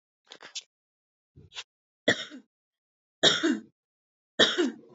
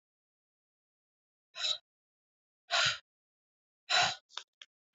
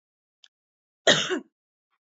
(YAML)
three_cough_length: 4.9 s
three_cough_amplitude: 14628
three_cough_signal_mean_std_ratio: 0.31
exhalation_length: 4.9 s
exhalation_amplitude: 6112
exhalation_signal_mean_std_ratio: 0.29
cough_length: 2.0 s
cough_amplitude: 21045
cough_signal_mean_std_ratio: 0.27
survey_phase: alpha (2021-03-01 to 2021-08-12)
age: 18-44
gender: Female
wearing_mask: 'No'
symptom_none: true
smoker_status: Never smoked
respiratory_condition_asthma: false
respiratory_condition_other: false
recruitment_source: REACT
submission_delay: 1 day
covid_test_result: Negative
covid_test_method: RT-qPCR